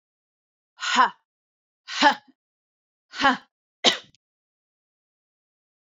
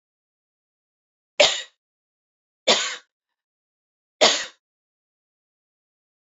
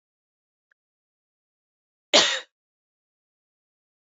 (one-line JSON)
{"exhalation_length": "5.9 s", "exhalation_amplitude": 29000, "exhalation_signal_mean_std_ratio": 0.26, "three_cough_length": "6.4 s", "three_cough_amplitude": 28883, "three_cough_signal_mean_std_ratio": 0.22, "cough_length": "4.0 s", "cough_amplitude": 24295, "cough_signal_mean_std_ratio": 0.18, "survey_phase": "beta (2021-08-13 to 2022-03-07)", "age": "18-44", "gender": "Female", "wearing_mask": "No", "symptom_cough_any": true, "symptom_runny_or_blocked_nose": true, "symptom_sore_throat": true, "symptom_fatigue": true, "symptom_headache": true, "smoker_status": "Never smoked", "respiratory_condition_asthma": false, "respiratory_condition_other": false, "recruitment_source": "Test and Trace", "submission_delay": "2 days", "covid_test_result": "Positive", "covid_test_method": "RT-qPCR", "covid_ct_value": 22.7, "covid_ct_gene": "ORF1ab gene"}